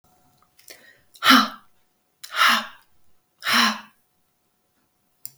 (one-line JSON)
{"exhalation_length": "5.4 s", "exhalation_amplitude": 31983, "exhalation_signal_mean_std_ratio": 0.31, "survey_phase": "beta (2021-08-13 to 2022-03-07)", "age": "65+", "gender": "Female", "wearing_mask": "No", "symptom_cough_any": true, "smoker_status": "Never smoked", "respiratory_condition_asthma": false, "respiratory_condition_other": true, "recruitment_source": "REACT", "submission_delay": "2 days", "covid_test_result": "Negative", "covid_test_method": "RT-qPCR", "influenza_a_test_result": "Negative", "influenza_b_test_result": "Negative"}